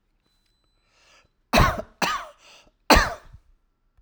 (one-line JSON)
{"cough_length": "4.0 s", "cough_amplitude": 32767, "cough_signal_mean_std_ratio": 0.3, "survey_phase": "alpha (2021-03-01 to 2021-08-12)", "age": "45-64", "gender": "Male", "wearing_mask": "No", "symptom_none": true, "smoker_status": "Ex-smoker", "respiratory_condition_asthma": false, "respiratory_condition_other": false, "recruitment_source": "REACT", "submission_delay": "1 day", "covid_test_result": "Negative", "covid_test_method": "RT-qPCR"}